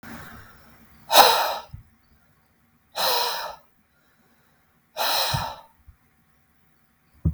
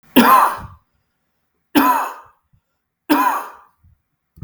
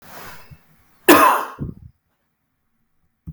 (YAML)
exhalation_length: 7.3 s
exhalation_amplitude: 32768
exhalation_signal_mean_std_ratio: 0.35
three_cough_length: 4.4 s
three_cough_amplitude: 32768
three_cough_signal_mean_std_ratio: 0.4
cough_length: 3.3 s
cough_amplitude: 32768
cough_signal_mean_std_ratio: 0.3
survey_phase: beta (2021-08-13 to 2022-03-07)
age: 45-64
gender: Male
wearing_mask: 'No'
symptom_none: true
symptom_onset: 5 days
smoker_status: Ex-smoker
respiratory_condition_asthma: false
respiratory_condition_other: false
recruitment_source: REACT
submission_delay: 2 days
covid_test_result: Negative
covid_test_method: RT-qPCR
influenza_a_test_result: Unknown/Void
influenza_b_test_result: Unknown/Void